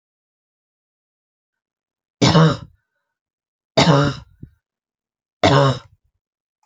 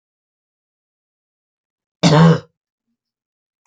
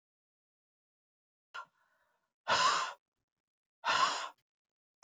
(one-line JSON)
{"three_cough_length": "6.7 s", "three_cough_amplitude": 30132, "three_cough_signal_mean_std_ratio": 0.31, "cough_length": "3.7 s", "cough_amplitude": 29128, "cough_signal_mean_std_ratio": 0.26, "exhalation_length": "5.0 s", "exhalation_amplitude": 4076, "exhalation_signal_mean_std_ratio": 0.33, "survey_phase": "beta (2021-08-13 to 2022-03-07)", "age": "45-64", "gender": "Female", "wearing_mask": "No", "symptom_none": true, "smoker_status": "Ex-smoker", "respiratory_condition_asthma": false, "respiratory_condition_other": false, "recruitment_source": "REACT", "submission_delay": "2 days", "covid_test_result": "Negative", "covid_test_method": "RT-qPCR"}